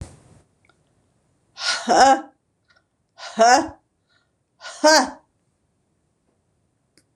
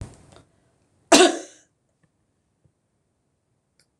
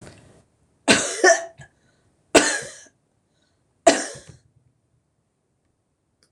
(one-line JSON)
{"exhalation_length": "7.2 s", "exhalation_amplitude": 26027, "exhalation_signal_mean_std_ratio": 0.31, "cough_length": "4.0 s", "cough_amplitude": 26027, "cough_signal_mean_std_ratio": 0.19, "three_cough_length": "6.3 s", "three_cough_amplitude": 26028, "three_cough_signal_mean_std_ratio": 0.27, "survey_phase": "beta (2021-08-13 to 2022-03-07)", "age": "65+", "gender": "Female", "wearing_mask": "No", "symptom_cough_any": true, "symptom_runny_or_blocked_nose": true, "smoker_status": "Ex-smoker", "respiratory_condition_asthma": false, "respiratory_condition_other": false, "recruitment_source": "REACT", "submission_delay": "3 days", "covid_test_result": "Negative", "covid_test_method": "RT-qPCR", "influenza_a_test_result": "Negative", "influenza_b_test_result": "Negative"}